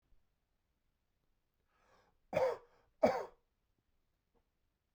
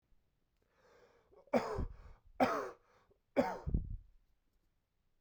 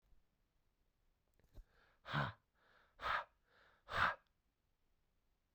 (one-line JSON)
{"cough_length": "4.9 s", "cough_amplitude": 4894, "cough_signal_mean_std_ratio": 0.23, "three_cough_length": "5.2 s", "three_cough_amplitude": 4013, "three_cough_signal_mean_std_ratio": 0.36, "exhalation_length": "5.5 s", "exhalation_amplitude": 2175, "exhalation_signal_mean_std_ratio": 0.29, "survey_phase": "beta (2021-08-13 to 2022-03-07)", "age": "18-44", "gender": "Male", "wearing_mask": "No", "symptom_none": true, "smoker_status": "Ex-smoker", "respiratory_condition_asthma": false, "respiratory_condition_other": false, "recruitment_source": "REACT", "submission_delay": "2 days", "covid_test_result": "Negative", "covid_test_method": "RT-qPCR"}